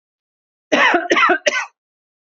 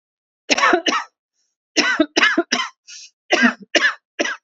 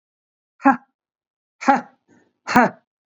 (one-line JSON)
{"cough_length": "2.3 s", "cough_amplitude": 30295, "cough_signal_mean_std_ratio": 0.48, "three_cough_length": "4.4 s", "three_cough_amplitude": 31910, "three_cough_signal_mean_std_ratio": 0.49, "exhalation_length": "3.2 s", "exhalation_amplitude": 27208, "exhalation_signal_mean_std_ratio": 0.29, "survey_phase": "beta (2021-08-13 to 2022-03-07)", "age": "18-44", "gender": "Female", "wearing_mask": "No", "symptom_fatigue": true, "symptom_headache": true, "symptom_onset": "5 days", "smoker_status": "Ex-smoker", "respiratory_condition_asthma": false, "respiratory_condition_other": false, "recruitment_source": "REACT", "submission_delay": "1 day", "covid_test_result": "Negative", "covid_test_method": "RT-qPCR", "influenza_a_test_result": "Negative", "influenza_b_test_result": "Negative"}